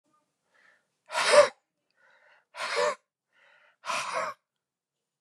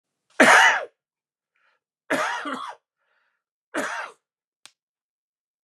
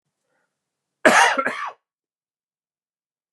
exhalation_length: 5.2 s
exhalation_amplitude: 15673
exhalation_signal_mean_std_ratio: 0.3
three_cough_length: 5.6 s
three_cough_amplitude: 30291
three_cough_signal_mean_std_ratio: 0.3
cough_length: 3.3 s
cough_amplitude: 32629
cough_signal_mean_std_ratio: 0.29
survey_phase: beta (2021-08-13 to 2022-03-07)
age: 18-44
gender: Male
wearing_mask: 'No'
symptom_cough_any: true
symptom_new_continuous_cough: true
symptom_diarrhoea: true
symptom_fatigue: true
symptom_fever_high_temperature: true
symptom_headache: true
smoker_status: Ex-smoker
respiratory_condition_asthma: false
respiratory_condition_other: false
recruitment_source: Test and Trace
submission_delay: 1 day
covid_test_result: Positive
covid_test_method: RT-qPCR
covid_ct_value: 17.8
covid_ct_gene: ORF1ab gene
covid_ct_mean: 18.7
covid_viral_load: 760000 copies/ml
covid_viral_load_category: Low viral load (10K-1M copies/ml)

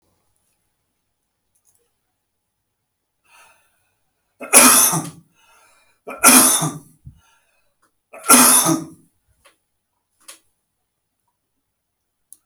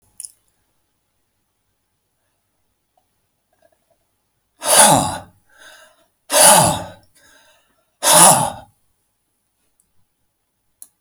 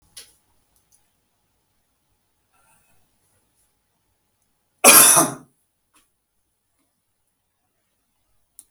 three_cough_length: 12.5 s
three_cough_amplitude: 32768
three_cough_signal_mean_std_ratio: 0.27
exhalation_length: 11.0 s
exhalation_amplitude: 32768
exhalation_signal_mean_std_ratio: 0.28
cough_length: 8.7 s
cough_amplitude: 32768
cough_signal_mean_std_ratio: 0.18
survey_phase: beta (2021-08-13 to 2022-03-07)
age: 45-64
gender: Male
wearing_mask: 'No'
symptom_none: true
smoker_status: Never smoked
respiratory_condition_asthma: false
respiratory_condition_other: false
recruitment_source: REACT
submission_delay: 2 days
covid_test_result: Negative
covid_test_method: RT-qPCR
covid_ct_value: 43.0
covid_ct_gene: N gene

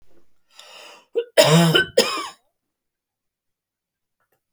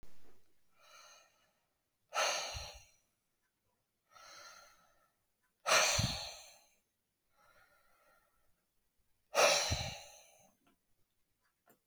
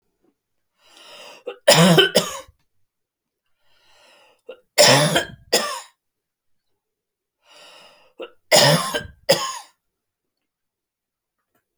cough_length: 4.5 s
cough_amplitude: 32187
cough_signal_mean_std_ratio: 0.33
exhalation_length: 11.9 s
exhalation_amplitude: 6017
exhalation_signal_mean_std_ratio: 0.32
three_cough_length: 11.8 s
three_cough_amplitude: 32768
three_cough_signal_mean_std_ratio: 0.31
survey_phase: beta (2021-08-13 to 2022-03-07)
age: 65+
gender: Female
wearing_mask: 'No'
symptom_none: true
smoker_status: Never smoked
respiratory_condition_asthma: false
respiratory_condition_other: false
recruitment_source: REACT
submission_delay: 2 days
covid_test_result: Negative
covid_test_method: RT-qPCR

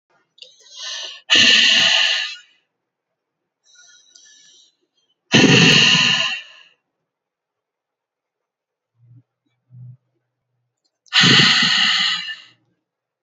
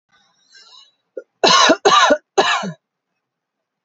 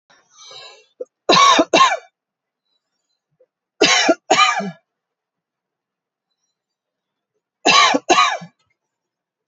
exhalation_length: 13.2 s
exhalation_amplitude: 32767
exhalation_signal_mean_std_ratio: 0.41
cough_length: 3.8 s
cough_amplitude: 32537
cough_signal_mean_std_ratio: 0.41
three_cough_length: 9.5 s
three_cough_amplitude: 32442
three_cough_signal_mean_std_ratio: 0.36
survey_phase: alpha (2021-03-01 to 2021-08-12)
age: 18-44
gender: Female
wearing_mask: 'No'
symptom_none: true
smoker_status: Never smoked
respiratory_condition_asthma: true
respiratory_condition_other: false
recruitment_source: REACT
submission_delay: 1 day
covid_test_result: Negative
covid_test_method: RT-qPCR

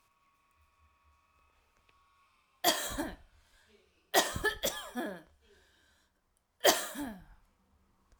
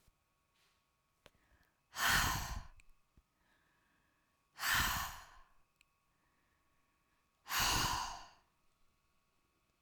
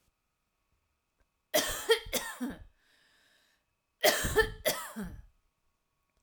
three_cough_length: 8.2 s
three_cough_amplitude: 13065
three_cough_signal_mean_std_ratio: 0.31
exhalation_length: 9.8 s
exhalation_amplitude: 3868
exhalation_signal_mean_std_ratio: 0.36
cough_length: 6.2 s
cough_amplitude: 9251
cough_signal_mean_std_ratio: 0.36
survey_phase: alpha (2021-03-01 to 2021-08-12)
age: 45-64
gender: Female
wearing_mask: 'No'
symptom_none: true
smoker_status: Never smoked
respiratory_condition_asthma: false
respiratory_condition_other: false
recruitment_source: REACT
submission_delay: 1 day
covid_test_result: Negative
covid_test_method: RT-qPCR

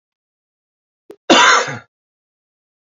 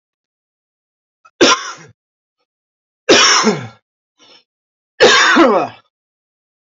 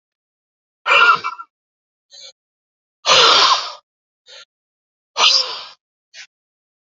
cough_length: 3.0 s
cough_amplitude: 29576
cough_signal_mean_std_ratio: 0.3
three_cough_length: 6.7 s
three_cough_amplitude: 32768
three_cough_signal_mean_std_ratio: 0.39
exhalation_length: 7.0 s
exhalation_amplitude: 31823
exhalation_signal_mean_std_ratio: 0.36
survey_phase: beta (2021-08-13 to 2022-03-07)
age: 45-64
gender: Male
wearing_mask: 'No'
symptom_cough_any: true
symptom_fatigue: true
symptom_headache: true
symptom_change_to_sense_of_smell_or_taste: true
symptom_loss_of_taste: true
symptom_other: true
smoker_status: Ex-smoker
respiratory_condition_asthma: false
respiratory_condition_other: false
recruitment_source: Test and Trace
submission_delay: 2 days
covid_test_result: Positive
covid_test_method: RT-qPCR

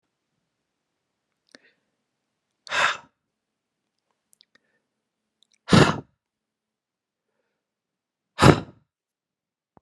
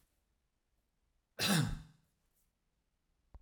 exhalation_length: 9.8 s
exhalation_amplitude: 31294
exhalation_signal_mean_std_ratio: 0.18
cough_length: 3.4 s
cough_amplitude: 3966
cough_signal_mean_std_ratio: 0.28
survey_phase: alpha (2021-03-01 to 2021-08-12)
age: 45-64
gender: Male
wearing_mask: 'No'
symptom_none: true
smoker_status: Never smoked
respiratory_condition_asthma: false
respiratory_condition_other: false
recruitment_source: REACT
submission_delay: 1 day
covid_test_result: Negative
covid_test_method: RT-qPCR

